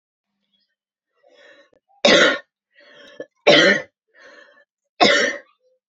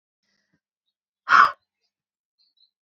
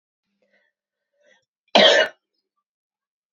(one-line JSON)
{"three_cough_length": "5.9 s", "three_cough_amplitude": 28523, "three_cough_signal_mean_std_ratio": 0.34, "exhalation_length": "2.8 s", "exhalation_amplitude": 26350, "exhalation_signal_mean_std_ratio": 0.21, "cough_length": "3.3 s", "cough_amplitude": 31403, "cough_signal_mean_std_ratio": 0.25, "survey_phase": "beta (2021-08-13 to 2022-03-07)", "age": "18-44", "gender": "Female", "wearing_mask": "No", "symptom_cough_any": true, "symptom_other": true, "smoker_status": "Ex-smoker", "respiratory_condition_asthma": false, "respiratory_condition_other": false, "recruitment_source": "Test and Trace", "submission_delay": "2 days", "covid_test_result": "Positive", "covid_test_method": "RT-qPCR", "covid_ct_value": 19.2, "covid_ct_gene": "ORF1ab gene", "covid_ct_mean": 19.5, "covid_viral_load": "410000 copies/ml", "covid_viral_load_category": "Low viral load (10K-1M copies/ml)"}